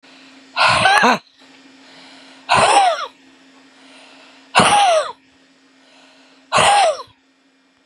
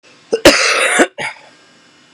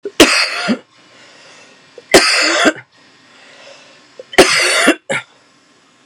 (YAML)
exhalation_length: 7.9 s
exhalation_amplitude: 32767
exhalation_signal_mean_std_ratio: 0.47
cough_length: 2.1 s
cough_amplitude: 32768
cough_signal_mean_std_ratio: 0.48
three_cough_length: 6.1 s
three_cough_amplitude: 32768
three_cough_signal_mean_std_ratio: 0.44
survey_phase: beta (2021-08-13 to 2022-03-07)
age: 18-44
gender: Female
wearing_mask: 'No'
symptom_runny_or_blocked_nose: true
symptom_abdominal_pain: true
symptom_diarrhoea: true
symptom_fatigue: true
symptom_fever_high_temperature: true
symptom_headache: true
symptom_onset: 3 days
smoker_status: Current smoker (11 or more cigarettes per day)
respiratory_condition_asthma: false
respiratory_condition_other: false
recruitment_source: Test and Trace
submission_delay: 2 days
covid_test_result: Positive
covid_test_method: RT-qPCR
covid_ct_value: 26.9
covid_ct_gene: N gene